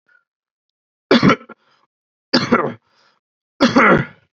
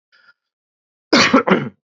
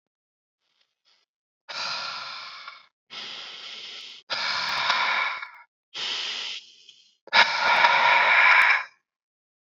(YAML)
three_cough_length: 4.4 s
three_cough_amplitude: 32768
three_cough_signal_mean_std_ratio: 0.37
cough_length: 2.0 s
cough_amplitude: 30910
cough_signal_mean_std_ratio: 0.38
exhalation_length: 9.7 s
exhalation_amplitude: 23362
exhalation_signal_mean_std_ratio: 0.49
survey_phase: beta (2021-08-13 to 2022-03-07)
age: 18-44
gender: Male
wearing_mask: 'No'
symptom_cough_any: true
symptom_runny_or_blocked_nose: true
symptom_diarrhoea: true
symptom_fatigue: true
smoker_status: Never smoked
respiratory_condition_asthma: false
respiratory_condition_other: false
recruitment_source: Test and Trace
submission_delay: 1 day
covid_test_result: Positive
covid_test_method: RT-qPCR